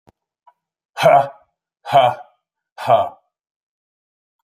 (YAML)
exhalation_length: 4.4 s
exhalation_amplitude: 27747
exhalation_signal_mean_std_ratio: 0.33
survey_phase: alpha (2021-03-01 to 2021-08-12)
age: 45-64
gender: Male
wearing_mask: 'No'
symptom_none: true
smoker_status: Never smoked
respiratory_condition_asthma: false
respiratory_condition_other: false
recruitment_source: REACT
submission_delay: 2 days
covid_test_result: Negative
covid_test_method: RT-qPCR